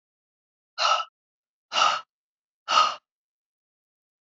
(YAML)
exhalation_length: 4.4 s
exhalation_amplitude: 14350
exhalation_signal_mean_std_ratio: 0.32
survey_phase: beta (2021-08-13 to 2022-03-07)
age: 65+
gender: Female
wearing_mask: 'No'
symptom_none: true
smoker_status: Ex-smoker
respiratory_condition_asthma: false
respiratory_condition_other: false
recruitment_source: REACT
submission_delay: 1 day
covid_test_result: Negative
covid_test_method: RT-qPCR